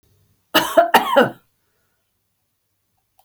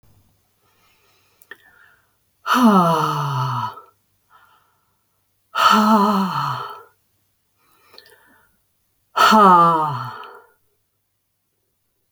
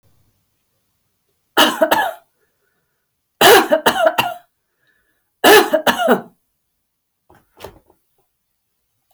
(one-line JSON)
{"cough_length": "3.2 s", "cough_amplitude": 32768, "cough_signal_mean_std_ratio": 0.32, "exhalation_length": "12.1 s", "exhalation_amplitude": 29256, "exhalation_signal_mean_std_ratio": 0.41, "three_cough_length": "9.1 s", "three_cough_amplitude": 32767, "three_cough_signal_mean_std_ratio": 0.35, "survey_phase": "beta (2021-08-13 to 2022-03-07)", "age": "65+", "gender": "Female", "wearing_mask": "No", "symptom_none": true, "smoker_status": "Never smoked", "respiratory_condition_asthma": false, "respiratory_condition_other": false, "recruitment_source": "REACT", "submission_delay": "5 days", "covid_test_result": "Negative", "covid_test_method": "RT-qPCR"}